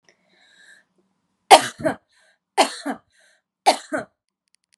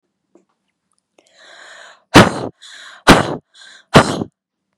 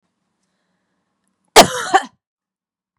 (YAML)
three_cough_length: 4.8 s
three_cough_amplitude: 32768
three_cough_signal_mean_std_ratio: 0.23
exhalation_length: 4.8 s
exhalation_amplitude: 32768
exhalation_signal_mean_std_ratio: 0.28
cough_length: 3.0 s
cough_amplitude: 32768
cough_signal_mean_std_ratio: 0.22
survey_phase: beta (2021-08-13 to 2022-03-07)
age: 45-64
gender: Female
wearing_mask: 'No'
symptom_none: true
smoker_status: Never smoked
respiratory_condition_asthma: false
respiratory_condition_other: false
recruitment_source: Test and Trace
submission_delay: 2 days
covid_test_result: Negative
covid_test_method: RT-qPCR